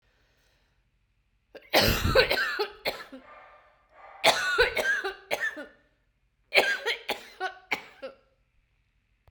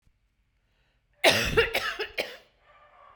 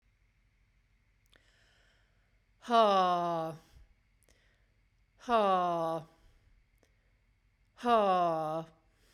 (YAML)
three_cough_length: 9.3 s
three_cough_amplitude: 21970
three_cough_signal_mean_std_ratio: 0.43
cough_length: 3.2 s
cough_amplitude: 15056
cough_signal_mean_std_ratio: 0.38
exhalation_length: 9.1 s
exhalation_amplitude: 7389
exhalation_signal_mean_std_ratio: 0.41
survey_phase: beta (2021-08-13 to 2022-03-07)
age: 45-64
gender: Female
wearing_mask: 'No'
symptom_cough_any: true
symptom_runny_or_blocked_nose: true
symptom_fatigue: true
symptom_change_to_sense_of_smell_or_taste: true
symptom_loss_of_taste: true
symptom_other: true
symptom_onset: 3 days
smoker_status: Never smoked
respiratory_condition_asthma: false
respiratory_condition_other: false
recruitment_source: Test and Trace
submission_delay: 2 days
covid_test_result: Positive
covid_test_method: ePCR